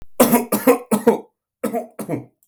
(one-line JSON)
{"cough_length": "2.5 s", "cough_amplitude": 32766, "cough_signal_mean_std_ratio": 0.5, "survey_phase": "beta (2021-08-13 to 2022-03-07)", "age": "45-64", "gender": "Male", "wearing_mask": "No", "symptom_runny_or_blocked_nose": true, "symptom_headache": true, "symptom_onset": "7 days", "smoker_status": "Never smoked", "respiratory_condition_asthma": false, "respiratory_condition_other": false, "recruitment_source": "Test and Trace", "submission_delay": "1 day", "covid_test_result": "Positive", "covid_test_method": "ePCR"}